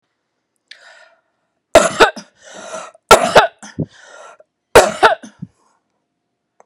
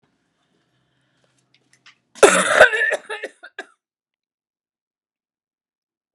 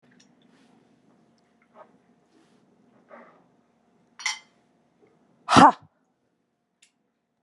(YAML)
three_cough_length: 6.7 s
three_cough_amplitude: 32768
three_cough_signal_mean_std_ratio: 0.29
cough_length: 6.1 s
cough_amplitude: 32768
cough_signal_mean_std_ratio: 0.25
exhalation_length: 7.4 s
exhalation_amplitude: 27861
exhalation_signal_mean_std_ratio: 0.15
survey_phase: beta (2021-08-13 to 2022-03-07)
age: 45-64
gender: Female
wearing_mask: 'No'
symptom_runny_or_blocked_nose: true
symptom_shortness_of_breath: true
symptom_sore_throat: true
symptom_abdominal_pain: true
symptom_fatigue: true
symptom_fever_high_temperature: true
symptom_headache: true
symptom_onset: 7 days
smoker_status: Ex-smoker
respiratory_condition_asthma: false
respiratory_condition_other: false
recruitment_source: REACT
submission_delay: 7 days
covid_test_result: Positive
covid_test_method: RT-qPCR
covid_ct_value: 33.5
covid_ct_gene: E gene
influenza_a_test_result: Negative
influenza_b_test_result: Negative